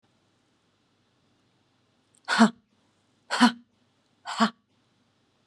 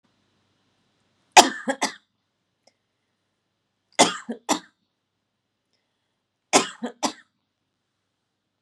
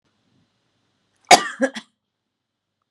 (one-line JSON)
{"exhalation_length": "5.5 s", "exhalation_amplitude": 20664, "exhalation_signal_mean_std_ratio": 0.23, "three_cough_length": "8.6 s", "three_cough_amplitude": 32768, "three_cough_signal_mean_std_ratio": 0.19, "cough_length": "2.9 s", "cough_amplitude": 32768, "cough_signal_mean_std_ratio": 0.18, "survey_phase": "beta (2021-08-13 to 2022-03-07)", "age": "45-64", "gender": "Female", "wearing_mask": "No", "symptom_none": true, "smoker_status": "Never smoked", "respiratory_condition_asthma": false, "respiratory_condition_other": false, "recruitment_source": "REACT", "submission_delay": "1 day", "covid_test_result": "Negative", "covid_test_method": "RT-qPCR"}